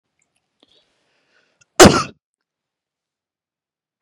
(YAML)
cough_length: 4.0 s
cough_amplitude: 32768
cough_signal_mean_std_ratio: 0.17
survey_phase: beta (2021-08-13 to 2022-03-07)
age: 45-64
gender: Female
wearing_mask: 'No'
symptom_cough_any: true
symptom_runny_or_blocked_nose: true
symptom_shortness_of_breath: true
symptom_sore_throat: true
symptom_fatigue: true
symptom_fever_high_temperature: true
symptom_headache: true
symptom_loss_of_taste: true
symptom_onset: 5 days
smoker_status: Never smoked
respiratory_condition_asthma: false
respiratory_condition_other: false
recruitment_source: Test and Trace
submission_delay: 2 days
covid_test_result: Positive
covid_test_method: RT-qPCR
covid_ct_value: 16.5
covid_ct_gene: ORF1ab gene
covid_ct_mean: 16.7
covid_viral_load: 3200000 copies/ml
covid_viral_load_category: High viral load (>1M copies/ml)